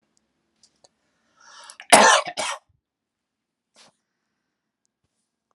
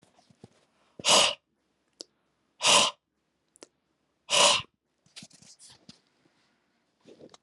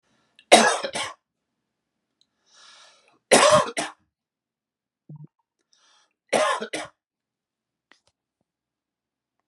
{"cough_length": "5.5 s", "cough_amplitude": 32767, "cough_signal_mean_std_ratio": 0.21, "exhalation_length": "7.4 s", "exhalation_amplitude": 15487, "exhalation_signal_mean_std_ratio": 0.28, "three_cough_length": "9.5 s", "three_cough_amplitude": 32767, "three_cough_signal_mean_std_ratio": 0.26, "survey_phase": "alpha (2021-03-01 to 2021-08-12)", "age": "45-64", "gender": "Male", "wearing_mask": "No", "symptom_none": true, "symptom_onset": "6 days", "smoker_status": "Never smoked", "respiratory_condition_asthma": false, "respiratory_condition_other": false, "recruitment_source": "REACT", "submission_delay": "2 days", "covid_test_result": "Negative", "covid_test_method": "RT-qPCR"}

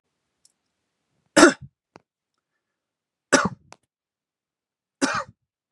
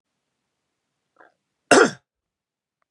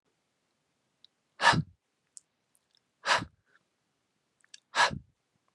{"three_cough_length": "5.7 s", "three_cough_amplitude": 32767, "three_cough_signal_mean_std_ratio": 0.2, "cough_length": "2.9 s", "cough_amplitude": 31157, "cough_signal_mean_std_ratio": 0.19, "exhalation_length": "5.5 s", "exhalation_amplitude": 12520, "exhalation_signal_mean_std_ratio": 0.24, "survey_phase": "beta (2021-08-13 to 2022-03-07)", "age": "18-44", "gender": "Male", "wearing_mask": "No", "symptom_none": true, "smoker_status": "Never smoked", "respiratory_condition_asthma": false, "respiratory_condition_other": false, "recruitment_source": "REACT", "submission_delay": "4 days", "covid_test_result": "Negative", "covid_test_method": "RT-qPCR", "influenza_a_test_result": "Negative", "influenza_b_test_result": "Negative"}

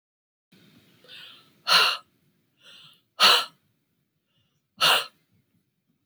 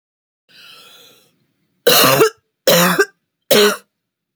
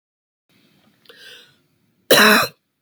{"exhalation_length": "6.1 s", "exhalation_amplitude": 20107, "exhalation_signal_mean_std_ratio": 0.29, "three_cough_length": "4.4 s", "three_cough_amplitude": 32768, "three_cough_signal_mean_std_ratio": 0.42, "cough_length": "2.8 s", "cough_amplitude": 31599, "cough_signal_mean_std_ratio": 0.3, "survey_phase": "beta (2021-08-13 to 2022-03-07)", "age": "45-64", "gender": "Female", "wearing_mask": "No", "symptom_cough_any": true, "symptom_runny_or_blocked_nose": true, "smoker_status": "Never smoked", "respiratory_condition_asthma": false, "respiratory_condition_other": false, "recruitment_source": "Test and Trace", "submission_delay": "2 days", "covid_test_result": "Negative", "covid_test_method": "RT-qPCR"}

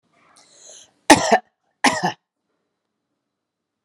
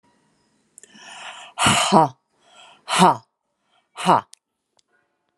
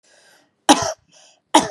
{"cough_length": "3.8 s", "cough_amplitude": 32768, "cough_signal_mean_std_ratio": 0.25, "exhalation_length": "5.4 s", "exhalation_amplitude": 32446, "exhalation_signal_mean_std_ratio": 0.32, "three_cough_length": "1.7 s", "three_cough_amplitude": 32768, "three_cough_signal_mean_std_ratio": 0.3, "survey_phase": "beta (2021-08-13 to 2022-03-07)", "age": "45-64", "gender": "Female", "wearing_mask": "No", "symptom_none": true, "smoker_status": "Never smoked", "respiratory_condition_asthma": false, "respiratory_condition_other": false, "recruitment_source": "REACT", "submission_delay": "1 day", "covid_test_result": "Negative", "covid_test_method": "RT-qPCR"}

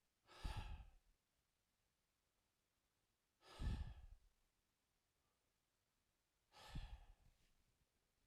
{"exhalation_length": "8.3 s", "exhalation_amplitude": 559, "exhalation_signal_mean_std_ratio": 0.32, "survey_phase": "alpha (2021-03-01 to 2021-08-12)", "age": "18-44", "gender": "Male", "wearing_mask": "No", "symptom_none": true, "smoker_status": "Ex-smoker", "respiratory_condition_asthma": false, "respiratory_condition_other": false, "recruitment_source": "REACT", "submission_delay": "1 day", "covid_test_result": "Negative", "covid_test_method": "RT-qPCR"}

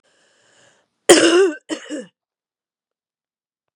{"cough_length": "3.8 s", "cough_amplitude": 32768, "cough_signal_mean_std_ratio": 0.3, "survey_phase": "beta (2021-08-13 to 2022-03-07)", "age": "45-64", "gender": "Female", "wearing_mask": "No", "symptom_cough_any": true, "symptom_runny_or_blocked_nose": true, "symptom_sore_throat": true, "symptom_fatigue": true, "symptom_other": true, "symptom_onset": "2 days", "smoker_status": "Ex-smoker", "respiratory_condition_asthma": false, "respiratory_condition_other": false, "recruitment_source": "Test and Trace", "submission_delay": "1 day", "covid_test_result": "Positive", "covid_test_method": "RT-qPCR", "covid_ct_value": 26.5, "covid_ct_gene": "ORF1ab gene"}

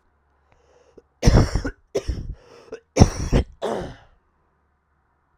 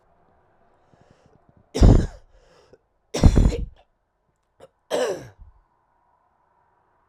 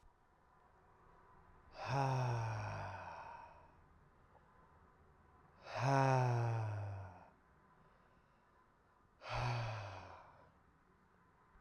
{"cough_length": "5.4 s", "cough_amplitude": 32768, "cough_signal_mean_std_ratio": 0.33, "three_cough_length": "7.1 s", "three_cough_amplitude": 32768, "three_cough_signal_mean_std_ratio": 0.27, "exhalation_length": "11.6 s", "exhalation_amplitude": 2630, "exhalation_signal_mean_std_ratio": 0.48, "survey_phase": "alpha (2021-03-01 to 2021-08-12)", "age": "18-44", "gender": "Male", "wearing_mask": "No", "symptom_cough_any": true, "symptom_new_continuous_cough": true, "symptom_abdominal_pain": true, "symptom_fatigue": true, "symptom_fever_high_temperature": true, "symptom_headache": true, "symptom_change_to_sense_of_smell_or_taste": true, "symptom_loss_of_taste": true, "symptom_onset": "5 days", "smoker_status": "Never smoked", "respiratory_condition_asthma": false, "respiratory_condition_other": false, "recruitment_source": "Test and Trace", "submission_delay": "2 days", "covid_test_result": "Positive", "covid_test_method": "RT-qPCR", "covid_ct_value": 14.2, "covid_ct_gene": "S gene", "covid_ct_mean": 14.6, "covid_viral_load": "16000000 copies/ml", "covid_viral_load_category": "High viral load (>1M copies/ml)"}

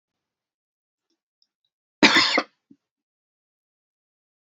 {"cough_length": "4.5 s", "cough_amplitude": 28948, "cough_signal_mean_std_ratio": 0.21, "survey_phase": "beta (2021-08-13 to 2022-03-07)", "age": "45-64", "gender": "Female", "wearing_mask": "No", "symptom_shortness_of_breath": true, "smoker_status": "Ex-smoker", "respiratory_condition_asthma": true, "respiratory_condition_other": false, "recruitment_source": "Test and Trace", "submission_delay": "1 day", "covid_test_result": "Negative", "covid_test_method": "RT-qPCR"}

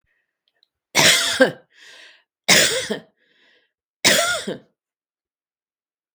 {"three_cough_length": "6.1 s", "three_cough_amplitude": 32768, "three_cough_signal_mean_std_ratio": 0.36, "survey_phase": "beta (2021-08-13 to 2022-03-07)", "age": "65+", "gender": "Female", "wearing_mask": "No", "symptom_none": true, "smoker_status": "Never smoked", "respiratory_condition_asthma": false, "respiratory_condition_other": false, "recruitment_source": "REACT", "submission_delay": "2 days", "covid_test_result": "Negative", "covid_test_method": "RT-qPCR", "influenza_a_test_result": "Unknown/Void", "influenza_b_test_result": "Unknown/Void"}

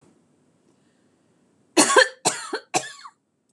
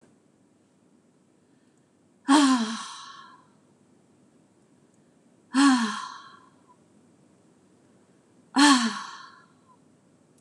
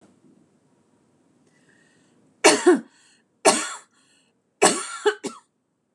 {"cough_length": "3.5 s", "cough_amplitude": 24710, "cough_signal_mean_std_ratio": 0.3, "exhalation_length": "10.4 s", "exhalation_amplitude": 20043, "exhalation_signal_mean_std_ratio": 0.31, "three_cough_length": "5.9 s", "three_cough_amplitude": 26028, "three_cough_signal_mean_std_ratio": 0.29, "survey_phase": "beta (2021-08-13 to 2022-03-07)", "age": "45-64", "gender": "Female", "wearing_mask": "No", "symptom_none": true, "smoker_status": "Never smoked", "respiratory_condition_asthma": false, "respiratory_condition_other": false, "recruitment_source": "REACT", "submission_delay": "3 days", "covid_test_result": "Negative", "covid_test_method": "RT-qPCR"}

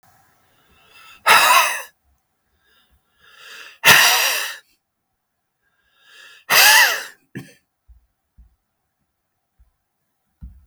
{"exhalation_length": "10.7 s", "exhalation_amplitude": 32768, "exhalation_signal_mean_std_ratio": 0.32, "survey_phase": "beta (2021-08-13 to 2022-03-07)", "age": "65+", "gender": "Male", "wearing_mask": "No", "symptom_none": true, "smoker_status": "Ex-smoker", "respiratory_condition_asthma": false, "respiratory_condition_other": false, "recruitment_source": "REACT", "submission_delay": "2 days", "covid_test_result": "Negative", "covid_test_method": "RT-qPCR", "influenza_a_test_result": "Unknown/Void", "influenza_b_test_result": "Unknown/Void"}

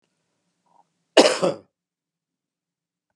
{"cough_length": "3.2 s", "cough_amplitude": 32203, "cough_signal_mean_std_ratio": 0.22, "survey_phase": "beta (2021-08-13 to 2022-03-07)", "age": "65+", "gender": "Male", "wearing_mask": "No", "symptom_none": true, "smoker_status": "Never smoked", "respiratory_condition_asthma": false, "respiratory_condition_other": false, "recruitment_source": "REACT", "submission_delay": "1 day", "covid_test_result": "Negative", "covid_test_method": "RT-qPCR", "influenza_a_test_result": "Negative", "influenza_b_test_result": "Negative"}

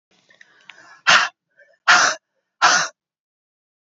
{"exhalation_length": "3.9 s", "exhalation_amplitude": 29765, "exhalation_signal_mean_std_ratio": 0.34, "survey_phase": "beta (2021-08-13 to 2022-03-07)", "age": "18-44", "gender": "Female", "wearing_mask": "No", "symptom_runny_or_blocked_nose": true, "symptom_sore_throat": true, "symptom_fatigue": true, "symptom_headache": true, "smoker_status": "Never smoked", "respiratory_condition_asthma": true, "respiratory_condition_other": false, "recruitment_source": "Test and Trace", "submission_delay": "2 days", "covid_test_result": "Positive", "covid_test_method": "RT-qPCR", "covid_ct_value": 22.5, "covid_ct_gene": "N gene"}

